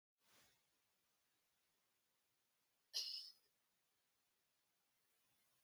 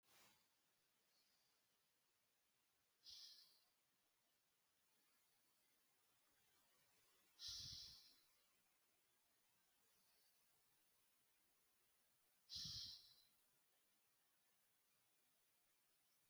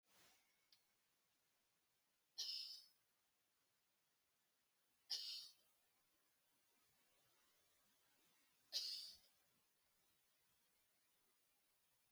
{"cough_length": "5.6 s", "cough_amplitude": 953, "cough_signal_mean_std_ratio": 0.23, "exhalation_length": "16.3 s", "exhalation_amplitude": 271, "exhalation_signal_mean_std_ratio": 0.37, "three_cough_length": "12.1 s", "three_cough_amplitude": 808, "three_cough_signal_mean_std_ratio": 0.3, "survey_phase": "beta (2021-08-13 to 2022-03-07)", "age": "45-64", "gender": "Female", "wearing_mask": "No", "symptom_cough_any": true, "symptom_new_continuous_cough": true, "symptom_runny_or_blocked_nose": true, "symptom_shortness_of_breath": true, "symptom_sore_throat": true, "symptom_fatigue": true, "symptom_headache": true, "symptom_change_to_sense_of_smell_or_taste": true, "symptom_loss_of_taste": true, "symptom_other": true, "symptom_onset": "3 days", "smoker_status": "Never smoked", "respiratory_condition_asthma": false, "respiratory_condition_other": false, "recruitment_source": "Test and Trace", "submission_delay": "2 days", "covid_test_result": "Positive", "covid_test_method": "RT-qPCR", "covid_ct_value": 31.0, "covid_ct_gene": "N gene"}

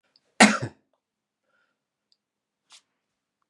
{"cough_length": "3.5 s", "cough_amplitude": 31963, "cough_signal_mean_std_ratio": 0.17, "survey_phase": "beta (2021-08-13 to 2022-03-07)", "age": "65+", "gender": "Male", "wearing_mask": "No", "symptom_none": true, "smoker_status": "Never smoked", "respiratory_condition_asthma": false, "respiratory_condition_other": false, "recruitment_source": "REACT", "submission_delay": "4 days", "covid_test_result": "Negative", "covid_test_method": "RT-qPCR", "influenza_a_test_result": "Negative", "influenza_b_test_result": "Negative"}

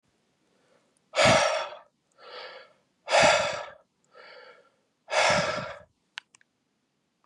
{"exhalation_length": "7.3 s", "exhalation_amplitude": 13413, "exhalation_signal_mean_std_ratio": 0.38, "survey_phase": "beta (2021-08-13 to 2022-03-07)", "age": "45-64", "gender": "Male", "wearing_mask": "No", "symptom_cough_any": true, "symptom_runny_or_blocked_nose": true, "smoker_status": "Never smoked", "respiratory_condition_asthma": false, "respiratory_condition_other": false, "recruitment_source": "Test and Trace", "submission_delay": "1 day", "covid_test_result": "Positive", "covid_test_method": "RT-qPCR", "covid_ct_value": 15.7, "covid_ct_gene": "ORF1ab gene"}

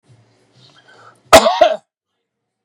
{"cough_length": "2.6 s", "cough_amplitude": 32768, "cough_signal_mean_std_ratio": 0.29, "survey_phase": "beta (2021-08-13 to 2022-03-07)", "age": "65+", "gender": "Male", "wearing_mask": "No", "symptom_none": true, "smoker_status": "Never smoked", "respiratory_condition_asthma": false, "respiratory_condition_other": false, "recruitment_source": "REACT", "submission_delay": "3 days", "covid_test_result": "Negative", "covid_test_method": "RT-qPCR", "influenza_a_test_result": "Negative", "influenza_b_test_result": "Negative"}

